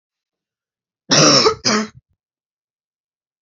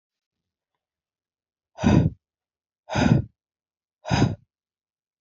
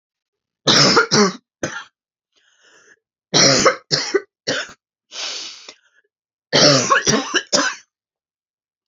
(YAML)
cough_length: 3.4 s
cough_amplitude: 31534
cough_signal_mean_std_ratio: 0.35
exhalation_length: 5.2 s
exhalation_amplitude: 20933
exhalation_signal_mean_std_ratio: 0.31
three_cough_length: 8.9 s
three_cough_amplitude: 32768
three_cough_signal_mean_std_ratio: 0.44
survey_phase: beta (2021-08-13 to 2022-03-07)
age: 18-44
gender: Female
wearing_mask: 'No'
symptom_cough_any: true
symptom_runny_or_blocked_nose: true
symptom_sore_throat: true
symptom_fatigue: true
symptom_headache: true
smoker_status: Never smoked
respiratory_condition_asthma: false
respiratory_condition_other: false
recruitment_source: Test and Trace
submission_delay: 1 day
covid_test_result: Positive
covid_test_method: RT-qPCR
covid_ct_value: 21.8
covid_ct_gene: ORF1ab gene